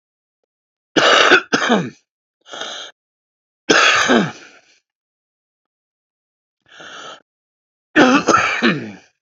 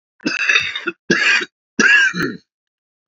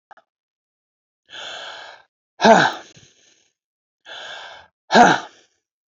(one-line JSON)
{"three_cough_length": "9.2 s", "three_cough_amplitude": 29886, "three_cough_signal_mean_std_ratio": 0.41, "cough_length": "3.1 s", "cough_amplitude": 28596, "cough_signal_mean_std_ratio": 0.56, "exhalation_length": "5.9 s", "exhalation_amplitude": 28396, "exhalation_signal_mean_std_ratio": 0.28, "survey_phase": "beta (2021-08-13 to 2022-03-07)", "age": "45-64", "gender": "Male", "wearing_mask": "No", "symptom_cough_any": true, "symptom_runny_or_blocked_nose": true, "symptom_onset": "4 days", "smoker_status": "Ex-smoker", "respiratory_condition_asthma": false, "respiratory_condition_other": false, "recruitment_source": "Test and Trace", "submission_delay": "1 day", "covid_test_result": "Positive", "covid_test_method": "ePCR"}